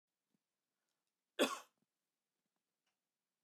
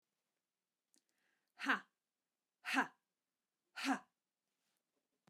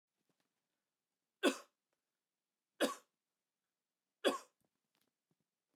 cough_length: 3.4 s
cough_amplitude: 2841
cough_signal_mean_std_ratio: 0.16
exhalation_length: 5.3 s
exhalation_amplitude: 3447
exhalation_signal_mean_std_ratio: 0.23
three_cough_length: 5.8 s
three_cough_amplitude: 3798
three_cough_signal_mean_std_ratio: 0.19
survey_phase: beta (2021-08-13 to 2022-03-07)
age: 45-64
gender: Female
wearing_mask: 'No'
symptom_none: true
smoker_status: Ex-smoker
respiratory_condition_asthma: false
respiratory_condition_other: false
recruitment_source: Test and Trace
submission_delay: 1 day
covid_test_result: Negative
covid_test_method: ePCR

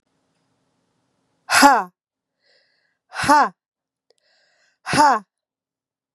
exhalation_length: 6.1 s
exhalation_amplitude: 32767
exhalation_signal_mean_std_ratio: 0.29
survey_phase: beta (2021-08-13 to 2022-03-07)
age: 18-44
gender: Female
wearing_mask: 'No'
symptom_cough_any: true
symptom_runny_or_blocked_nose: true
symptom_fatigue: true
symptom_fever_high_temperature: true
symptom_headache: true
symptom_onset: 2 days
smoker_status: Never smoked
respiratory_condition_asthma: false
respiratory_condition_other: false
recruitment_source: Test and Trace
submission_delay: 2 days
covid_test_result: Positive
covid_test_method: RT-qPCR
covid_ct_value: 21.7
covid_ct_gene: ORF1ab gene
covid_ct_mean: 21.9
covid_viral_load: 65000 copies/ml
covid_viral_load_category: Low viral load (10K-1M copies/ml)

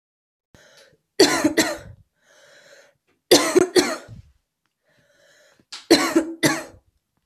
three_cough_length: 7.3 s
three_cough_amplitude: 32258
three_cough_signal_mean_std_ratio: 0.35
survey_phase: beta (2021-08-13 to 2022-03-07)
age: 18-44
gender: Female
wearing_mask: 'No'
symptom_sore_throat: true
symptom_fatigue: true
symptom_onset: 2 days
smoker_status: Ex-smoker
respiratory_condition_asthma: false
respiratory_condition_other: false
recruitment_source: Test and Trace
submission_delay: 1 day
covid_test_result: Positive
covid_test_method: RT-qPCR
covid_ct_value: 22.0
covid_ct_gene: ORF1ab gene
covid_ct_mean: 22.7
covid_viral_load: 37000 copies/ml
covid_viral_load_category: Low viral load (10K-1M copies/ml)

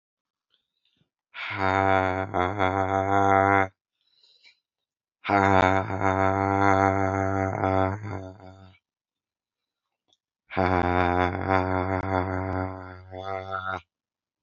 exhalation_length: 14.4 s
exhalation_amplitude: 24449
exhalation_signal_mean_std_ratio: 0.49
survey_phase: beta (2021-08-13 to 2022-03-07)
age: 45-64
gender: Male
wearing_mask: 'No'
symptom_cough_any: true
symptom_sore_throat: true
symptom_fever_high_temperature: true
symptom_headache: true
symptom_change_to_sense_of_smell_or_taste: true
smoker_status: Ex-smoker
respiratory_condition_asthma: true
respiratory_condition_other: false
recruitment_source: Test and Trace
submission_delay: 2 days
covid_test_result: Positive
covid_test_method: RT-qPCR
covid_ct_value: 16.8
covid_ct_gene: ORF1ab gene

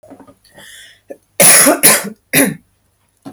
cough_length: 3.3 s
cough_amplitude: 32768
cough_signal_mean_std_ratio: 0.44
survey_phase: beta (2021-08-13 to 2022-03-07)
age: 18-44
gender: Female
wearing_mask: 'No'
symptom_none: true
smoker_status: Never smoked
respiratory_condition_asthma: false
respiratory_condition_other: false
recruitment_source: REACT
submission_delay: 5 days
covid_test_result: Negative
covid_test_method: RT-qPCR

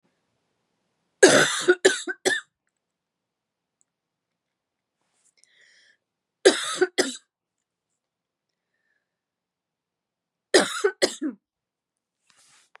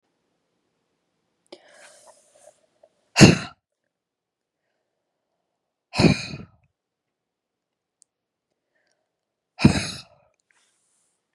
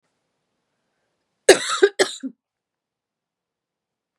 three_cough_length: 12.8 s
three_cough_amplitude: 31939
three_cough_signal_mean_std_ratio: 0.25
exhalation_length: 11.3 s
exhalation_amplitude: 32768
exhalation_signal_mean_std_ratio: 0.17
cough_length: 4.2 s
cough_amplitude: 32767
cough_signal_mean_std_ratio: 0.21
survey_phase: beta (2021-08-13 to 2022-03-07)
age: 45-64
gender: Female
wearing_mask: 'No'
symptom_cough_any: true
symptom_runny_or_blocked_nose: true
smoker_status: Ex-smoker
respiratory_condition_asthma: false
respiratory_condition_other: false
recruitment_source: Test and Trace
submission_delay: 1 day
covid_test_result: Positive
covid_test_method: RT-qPCR
covid_ct_value: 22.4
covid_ct_gene: ORF1ab gene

